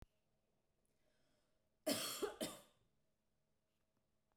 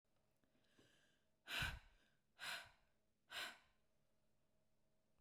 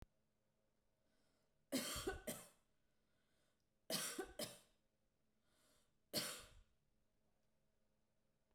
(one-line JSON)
{"cough_length": "4.4 s", "cough_amplitude": 1607, "cough_signal_mean_std_ratio": 0.3, "exhalation_length": "5.2 s", "exhalation_amplitude": 685, "exhalation_signal_mean_std_ratio": 0.35, "three_cough_length": "8.5 s", "three_cough_amplitude": 1065, "three_cough_signal_mean_std_ratio": 0.34, "survey_phase": "beta (2021-08-13 to 2022-03-07)", "age": "18-44", "gender": "Female", "wearing_mask": "No", "symptom_none": true, "smoker_status": "Never smoked", "respiratory_condition_asthma": false, "respiratory_condition_other": false, "recruitment_source": "REACT", "submission_delay": "2 days", "covid_test_result": "Negative", "covid_test_method": "RT-qPCR"}